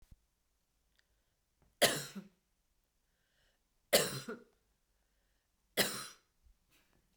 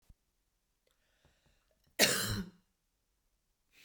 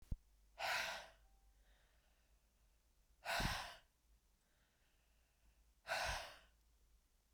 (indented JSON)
{
  "three_cough_length": "7.2 s",
  "three_cough_amplitude": 8080,
  "three_cough_signal_mean_std_ratio": 0.24,
  "cough_length": "3.8 s",
  "cough_amplitude": 8159,
  "cough_signal_mean_std_ratio": 0.25,
  "exhalation_length": "7.3 s",
  "exhalation_amplitude": 1189,
  "exhalation_signal_mean_std_ratio": 0.39,
  "survey_phase": "beta (2021-08-13 to 2022-03-07)",
  "age": "45-64",
  "gender": "Female",
  "wearing_mask": "No",
  "symptom_none": true,
  "smoker_status": "Ex-smoker",
  "respiratory_condition_asthma": false,
  "respiratory_condition_other": false,
  "recruitment_source": "REACT",
  "submission_delay": "1 day",
  "covid_test_result": "Negative",
  "covid_test_method": "RT-qPCR",
  "influenza_a_test_result": "Negative",
  "influenza_b_test_result": "Negative"
}